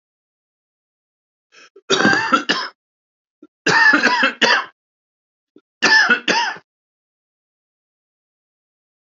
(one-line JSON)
{"three_cough_length": "9.0 s", "three_cough_amplitude": 28457, "three_cough_signal_mean_std_ratio": 0.39, "survey_phase": "alpha (2021-03-01 to 2021-08-12)", "age": "45-64", "gender": "Male", "wearing_mask": "No", "symptom_cough_any": true, "symptom_diarrhoea": true, "symptom_fever_high_temperature": true, "symptom_headache": true, "symptom_onset": "3 days", "smoker_status": "Never smoked", "respiratory_condition_asthma": false, "respiratory_condition_other": false, "recruitment_source": "Test and Trace", "submission_delay": "2 days", "covid_test_result": "Positive", "covid_test_method": "RT-qPCR"}